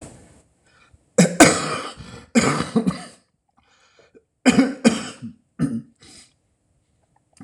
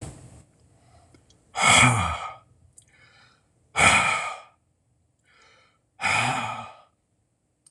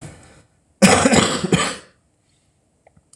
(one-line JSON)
{"three_cough_length": "7.4 s", "three_cough_amplitude": 26028, "three_cough_signal_mean_std_ratio": 0.35, "exhalation_length": "7.7 s", "exhalation_amplitude": 24301, "exhalation_signal_mean_std_ratio": 0.38, "cough_length": "3.2 s", "cough_amplitude": 26028, "cough_signal_mean_std_ratio": 0.4, "survey_phase": "beta (2021-08-13 to 2022-03-07)", "age": "65+", "gender": "Male", "wearing_mask": "No", "symptom_cough_any": true, "symptom_runny_or_blocked_nose": true, "symptom_sore_throat": true, "symptom_fatigue": true, "symptom_fever_high_temperature": true, "symptom_headache": true, "symptom_onset": "4 days", "smoker_status": "Never smoked", "respiratory_condition_asthma": false, "respiratory_condition_other": false, "recruitment_source": "Test and Trace", "submission_delay": "2 days", "covid_test_result": "Positive", "covid_test_method": "ePCR"}